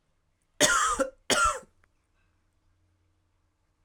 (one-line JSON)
{"cough_length": "3.8 s", "cough_amplitude": 17180, "cough_signal_mean_std_ratio": 0.36, "survey_phase": "beta (2021-08-13 to 2022-03-07)", "age": "18-44", "gender": "Male", "wearing_mask": "No", "symptom_fatigue": true, "symptom_headache": true, "symptom_change_to_sense_of_smell_or_taste": true, "symptom_loss_of_taste": true, "symptom_onset": "6 days", "smoker_status": "Never smoked", "respiratory_condition_asthma": false, "respiratory_condition_other": false, "recruitment_source": "Test and Trace", "submission_delay": "3 days", "covid_test_result": "Positive", "covid_test_method": "RT-qPCR", "covid_ct_value": 17.0, "covid_ct_gene": "ORF1ab gene", "covid_ct_mean": 17.5, "covid_viral_load": "1800000 copies/ml", "covid_viral_load_category": "High viral load (>1M copies/ml)"}